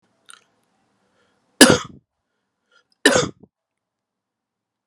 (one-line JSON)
{"cough_length": "4.9 s", "cough_amplitude": 32768, "cough_signal_mean_std_ratio": 0.2, "survey_phase": "alpha (2021-03-01 to 2021-08-12)", "age": "45-64", "gender": "Male", "wearing_mask": "No", "symptom_cough_any": true, "symptom_change_to_sense_of_smell_or_taste": true, "symptom_onset": "7 days", "smoker_status": "Ex-smoker", "respiratory_condition_asthma": false, "respiratory_condition_other": false, "recruitment_source": "Test and Trace", "submission_delay": "2 days", "covid_test_result": "Positive", "covid_test_method": "RT-qPCR"}